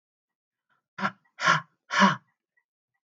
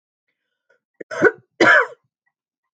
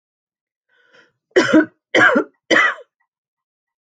{"exhalation_length": "3.1 s", "exhalation_amplitude": 19878, "exhalation_signal_mean_std_ratio": 0.3, "cough_length": "2.7 s", "cough_amplitude": 27019, "cough_signal_mean_std_ratio": 0.3, "three_cough_length": "3.8 s", "three_cough_amplitude": 28453, "three_cough_signal_mean_std_ratio": 0.37, "survey_phase": "alpha (2021-03-01 to 2021-08-12)", "age": "45-64", "gender": "Female", "wearing_mask": "No", "symptom_none": true, "smoker_status": "Never smoked", "respiratory_condition_asthma": false, "respiratory_condition_other": false, "recruitment_source": "REACT", "submission_delay": "1 day", "covid_test_result": "Negative", "covid_test_method": "RT-qPCR"}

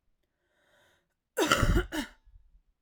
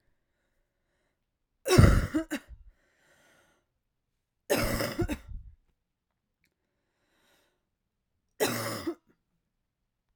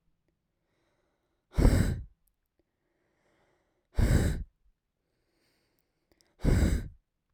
{"cough_length": "2.8 s", "cough_amplitude": 15030, "cough_signal_mean_std_ratio": 0.36, "three_cough_length": "10.2 s", "three_cough_amplitude": 15800, "three_cough_signal_mean_std_ratio": 0.27, "exhalation_length": "7.3 s", "exhalation_amplitude": 12242, "exhalation_signal_mean_std_ratio": 0.33, "survey_phase": "alpha (2021-03-01 to 2021-08-12)", "age": "18-44", "gender": "Female", "wearing_mask": "No", "symptom_cough_any": true, "symptom_diarrhoea": true, "symptom_fatigue": true, "symptom_fever_high_temperature": true, "symptom_headache": true, "symptom_onset": "2 days", "smoker_status": "Current smoker (e-cigarettes or vapes only)", "respiratory_condition_asthma": false, "respiratory_condition_other": false, "recruitment_source": "Test and Trace", "submission_delay": "2 days", "covid_test_result": "Positive", "covid_test_method": "RT-qPCR", "covid_ct_value": 27.9, "covid_ct_gene": "ORF1ab gene", "covid_ct_mean": 28.4, "covid_viral_load": "500 copies/ml", "covid_viral_load_category": "Minimal viral load (< 10K copies/ml)"}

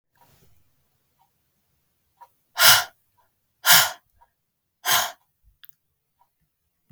{"exhalation_length": "6.9 s", "exhalation_amplitude": 32768, "exhalation_signal_mean_std_ratio": 0.24, "survey_phase": "beta (2021-08-13 to 2022-03-07)", "age": "18-44", "gender": "Female", "wearing_mask": "No", "symptom_none": true, "smoker_status": "Never smoked", "respiratory_condition_asthma": false, "respiratory_condition_other": false, "recruitment_source": "REACT", "submission_delay": "2 days", "covid_test_result": "Negative", "covid_test_method": "RT-qPCR"}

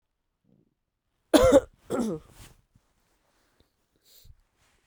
{"cough_length": "4.9 s", "cough_amplitude": 22915, "cough_signal_mean_std_ratio": 0.24, "survey_phase": "beta (2021-08-13 to 2022-03-07)", "age": "18-44", "gender": "Female", "wearing_mask": "No", "symptom_cough_any": true, "symptom_runny_or_blocked_nose": true, "symptom_abdominal_pain": true, "symptom_fever_high_temperature": true, "symptom_headache": true, "symptom_other": true, "smoker_status": "Never smoked", "respiratory_condition_asthma": false, "respiratory_condition_other": false, "recruitment_source": "Test and Trace", "submission_delay": "1 day", "covid_test_result": "Positive", "covid_test_method": "LFT"}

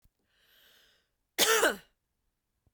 {"cough_length": "2.7 s", "cough_amplitude": 10527, "cough_signal_mean_std_ratio": 0.29, "survey_phase": "beta (2021-08-13 to 2022-03-07)", "age": "45-64", "gender": "Female", "wearing_mask": "No", "symptom_none": true, "smoker_status": "Never smoked", "respiratory_condition_asthma": false, "respiratory_condition_other": false, "recruitment_source": "REACT", "submission_delay": "0 days", "covid_test_result": "Negative", "covid_test_method": "RT-qPCR"}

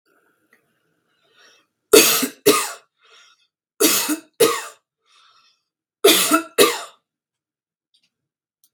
{"three_cough_length": "8.7 s", "three_cough_amplitude": 32768, "three_cough_signal_mean_std_ratio": 0.33, "survey_phase": "beta (2021-08-13 to 2022-03-07)", "age": "18-44", "gender": "Female", "wearing_mask": "No", "symptom_abdominal_pain": true, "symptom_diarrhoea": true, "symptom_fatigue": true, "symptom_fever_high_temperature": true, "symptom_onset": "3 days", "smoker_status": "Never smoked", "respiratory_condition_asthma": false, "respiratory_condition_other": false, "recruitment_source": "Test and Trace", "submission_delay": "1 day", "covid_test_result": "Negative", "covid_test_method": "RT-qPCR"}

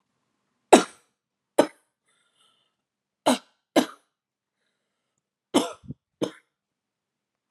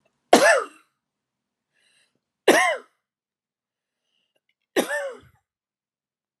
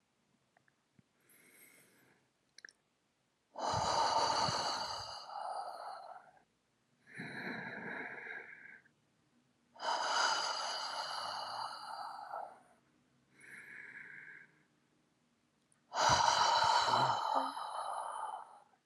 {"cough_length": "7.5 s", "cough_amplitude": 32734, "cough_signal_mean_std_ratio": 0.18, "three_cough_length": "6.4 s", "three_cough_amplitude": 32767, "three_cough_signal_mean_std_ratio": 0.27, "exhalation_length": "18.9 s", "exhalation_amplitude": 5398, "exhalation_signal_mean_std_ratio": 0.52, "survey_phase": "alpha (2021-03-01 to 2021-08-12)", "age": "45-64", "gender": "Female", "wearing_mask": "No", "symptom_fatigue": true, "symptom_onset": "5 days", "smoker_status": "Never smoked", "respiratory_condition_asthma": true, "respiratory_condition_other": false, "recruitment_source": "REACT", "submission_delay": "1 day", "covid_test_result": "Negative", "covid_test_method": "RT-qPCR"}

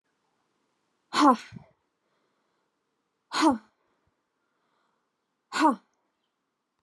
{"exhalation_length": "6.8 s", "exhalation_amplitude": 16308, "exhalation_signal_mean_std_ratio": 0.24, "survey_phase": "alpha (2021-03-01 to 2021-08-12)", "age": "18-44", "gender": "Female", "wearing_mask": "No", "symptom_shortness_of_breath": true, "smoker_status": "Never smoked", "respiratory_condition_asthma": false, "respiratory_condition_other": false, "recruitment_source": "REACT", "submission_delay": "1 day", "covid_test_result": "Negative", "covid_test_method": "RT-qPCR"}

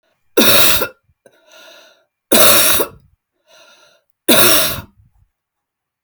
{"three_cough_length": "6.0 s", "three_cough_amplitude": 32768, "three_cough_signal_mean_std_ratio": 0.42, "survey_phase": "beta (2021-08-13 to 2022-03-07)", "age": "45-64", "gender": "Female", "wearing_mask": "No", "symptom_cough_any": true, "symptom_runny_or_blocked_nose": true, "symptom_diarrhoea": true, "symptom_fatigue": true, "symptom_onset": "8 days", "smoker_status": "Never smoked", "respiratory_condition_asthma": false, "respiratory_condition_other": false, "recruitment_source": "REACT", "submission_delay": "2 days", "covid_test_result": "Negative", "covid_test_method": "RT-qPCR"}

